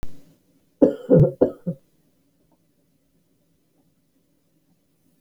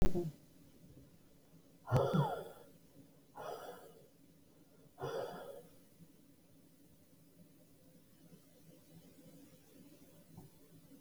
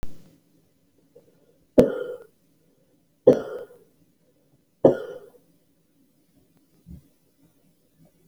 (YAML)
cough_length: 5.2 s
cough_amplitude: 26217
cough_signal_mean_std_ratio: 0.26
exhalation_length: 11.0 s
exhalation_amplitude: 4196
exhalation_signal_mean_std_ratio: 0.32
three_cough_length: 8.3 s
three_cough_amplitude: 32337
three_cough_signal_mean_std_ratio: 0.21
survey_phase: beta (2021-08-13 to 2022-03-07)
age: 65+
gender: Female
wearing_mask: 'No'
symptom_abdominal_pain: true
symptom_fatigue: true
smoker_status: Ex-smoker
respiratory_condition_asthma: true
respiratory_condition_other: false
recruitment_source: REACT
submission_delay: 4 days
covid_test_result: Negative
covid_test_method: RT-qPCR